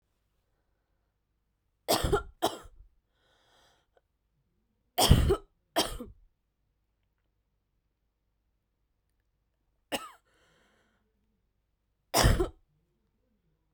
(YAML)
three_cough_length: 13.7 s
three_cough_amplitude: 18424
three_cough_signal_mean_std_ratio: 0.24
survey_phase: beta (2021-08-13 to 2022-03-07)
age: 18-44
gender: Female
wearing_mask: 'No'
symptom_cough_any: true
symptom_runny_or_blocked_nose: true
symptom_headache: true
symptom_change_to_sense_of_smell_or_taste: true
symptom_loss_of_taste: true
symptom_onset: 4 days
smoker_status: Never smoked
respiratory_condition_asthma: false
respiratory_condition_other: false
recruitment_source: Test and Trace
submission_delay: 1 day
covid_test_result: Positive
covid_test_method: RT-qPCR